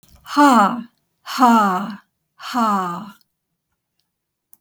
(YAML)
exhalation_length: 4.6 s
exhalation_amplitude: 28595
exhalation_signal_mean_std_ratio: 0.47
survey_phase: beta (2021-08-13 to 2022-03-07)
age: 65+
gender: Female
wearing_mask: 'No'
symptom_none: true
smoker_status: Never smoked
respiratory_condition_asthma: false
respiratory_condition_other: false
recruitment_source: REACT
submission_delay: 2 days
covid_test_result: Negative
covid_test_method: RT-qPCR
influenza_a_test_result: Negative
influenza_b_test_result: Negative